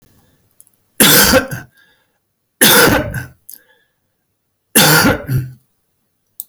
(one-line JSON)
{"three_cough_length": "6.5 s", "three_cough_amplitude": 32768, "three_cough_signal_mean_std_ratio": 0.43, "survey_phase": "beta (2021-08-13 to 2022-03-07)", "age": "65+", "gender": "Male", "wearing_mask": "No", "symptom_none": true, "smoker_status": "Ex-smoker", "respiratory_condition_asthma": false, "respiratory_condition_other": false, "recruitment_source": "REACT", "submission_delay": "1 day", "covid_test_result": "Negative", "covid_test_method": "RT-qPCR"}